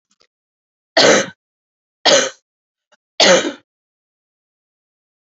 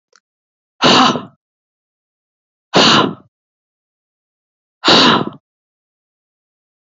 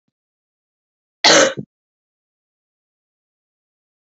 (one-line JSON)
{"three_cough_length": "5.2 s", "three_cough_amplitude": 32768, "three_cough_signal_mean_std_ratio": 0.31, "exhalation_length": "6.8 s", "exhalation_amplitude": 31605, "exhalation_signal_mean_std_ratio": 0.34, "cough_length": "4.0 s", "cough_amplitude": 32768, "cough_signal_mean_std_ratio": 0.21, "survey_phase": "beta (2021-08-13 to 2022-03-07)", "age": "18-44", "gender": "Female", "wearing_mask": "No", "symptom_cough_any": true, "symptom_runny_or_blocked_nose": true, "symptom_abdominal_pain": true, "symptom_fatigue": true, "symptom_loss_of_taste": true, "symptom_other": true, "smoker_status": "Never smoked", "respiratory_condition_asthma": false, "respiratory_condition_other": false, "recruitment_source": "Test and Trace", "submission_delay": "0 days", "covid_test_result": "Positive", "covid_test_method": "LFT"}